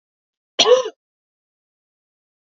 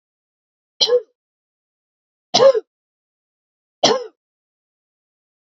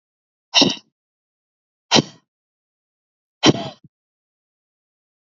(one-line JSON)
{"cough_length": "2.5 s", "cough_amplitude": 30039, "cough_signal_mean_std_ratio": 0.25, "three_cough_length": "5.5 s", "three_cough_amplitude": 30183, "three_cough_signal_mean_std_ratio": 0.25, "exhalation_length": "5.3 s", "exhalation_amplitude": 32767, "exhalation_signal_mean_std_ratio": 0.22, "survey_phase": "beta (2021-08-13 to 2022-03-07)", "age": "18-44", "gender": "Female", "wearing_mask": "No", "symptom_runny_or_blocked_nose": true, "symptom_sore_throat": true, "symptom_fatigue": true, "symptom_headache": true, "symptom_other": true, "symptom_onset": "4 days", "smoker_status": "Never smoked", "respiratory_condition_asthma": false, "respiratory_condition_other": true, "recruitment_source": "Test and Trace", "submission_delay": "2 days", "covid_test_result": "Positive", "covid_test_method": "RT-qPCR", "covid_ct_value": 20.6, "covid_ct_gene": "ORF1ab gene"}